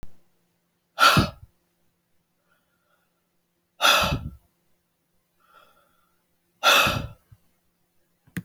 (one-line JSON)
{"exhalation_length": "8.4 s", "exhalation_amplitude": 20406, "exhalation_signal_mean_std_ratio": 0.29, "survey_phase": "beta (2021-08-13 to 2022-03-07)", "age": "45-64", "gender": "Female", "wearing_mask": "No", "symptom_none": true, "smoker_status": "Never smoked", "respiratory_condition_asthma": false, "respiratory_condition_other": false, "recruitment_source": "Test and Trace", "submission_delay": "0 days", "covid_test_result": "Negative", "covid_test_method": "LFT"}